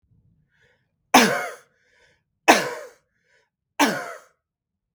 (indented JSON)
{
  "three_cough_length": "4.9 s",
  "three_cough_amplitude": 32768,
  "three_cough_signal_mean_std_ratio": 0.28,
  "survey_phase": "beta (2021-08-13 to 2022-03-07)",
  "age": "65+",
  "gender": "Male",
  "wearing_mask": "No",
  "symptom_cough_any": true,
  "symptom_runny_or_blocked_nose": true,
  "smoker_status": "Prefer not to say",
  "respiratory_condition_asthma": false,
  "respiratory_condition_other": false,
  "recruitment_source": "REACT",
  "submission_delay": "2 days",
  "covid_test_result": "Negative",
  "covid_test_method": "RT-qPCR"
}